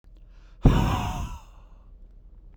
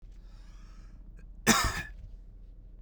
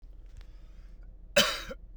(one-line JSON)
{"exhalation_length": "2.6 s", "exhalation_amplitude": 22818, "exhalation_signal_mean_std_ratio": 0.41, "cough_length": "2.8 s", "cough_amplitude": 12795, "cough_signal_mean_std_ratio": 0.43, "three_cough_length": "2.0 s", "three_cough_amplitude": 11798, "three_cough_signal_mean_std_ratio": 0.41, "survey_phase": "beta (2021-08-13 to 2022-03-07)", "age": "18-44", "gender": "Male", "wearing_mask": "No", "symptom_none": true, "smoker_status": "Current smoker (11 or more cigarettes per day)", "respiratory_condition_asthma": false, "respiratory_condition_other": false, "recruitment_source": "REACT", "submission_delay": "1 day", "covid_test_result": "Negative", "covid_test_method": "RT-qPCR", "influenza_a_test_result": "Negative", "influenza_b_test_result": "Negative"}